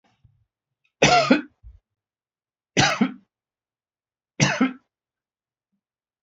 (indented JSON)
{
  "three_cough_length": "6.2 s",
  "three_cough_amplitude": 23920,
  "three_cough_signal_mean_std_ratio": 0.3,
  "survey_phase": "beta (2021-08-13 to 2022-03-07)",
  "age": "65+",
  "gender": "Male",
  "wearing_mask": "No",
  "symptom_none": true,
  "symptom_onset": "12 days",
  "smoker_status": "Never smoked",
  "respiratory_condition_asthma": false,
  "respiratory_condition_other": false,
  "recruitment_source": "REACT",
  "submission_delay": "3 days",
  "covid_test_result": "Negative",
  "covid_test_method": "RT-qPCR",
  "influenza_a_test_result": "Negative",
  "influenza_b_test_result": "Negative"
}